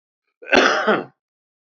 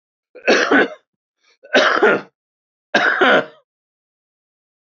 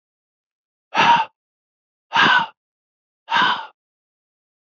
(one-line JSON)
{"cough_length": "1.8 s", "cough_amplitude": 27312, "cough_signal_mean_std_ratio": 0.41, "three_cough_length": "4.9 s", "three_cough_amplitude": 30457, "three_cough_signal_mean_std_ratio": 0.43, "exhalation_length": "4.7 s", "exhalation_amplitude": 24583, "exhalation_signal_mean_std_ratio": 0.36, "survey_phase": "beta (2021-08-13 to 2022-03-07)", "age": "45-64", "gender": "Male", "wearing_mask": "No", "symptom_headache": true, "symptom_change_to_sense_of_smell_or_taste": true, "symptom_onset": "5 days", "smoker_status": "Never smoked", "respiratory_condition_asthma": false, "respiratory_condition_other": false, "recruitment_source": "Test and Trace", "submission_delay": "2 days", "covid_test_result": "Positive", "covid_test_method": "RT-qPCR", "covid_ct_value": 21.7, "covid_ct_gene": "ORF1ab gene", "covid_ct_mean": 22.6, "covid_viral_load": "39000 copies/ml", "covid_viral_load_category": "Low viral load (10K-1M copies/ml)"}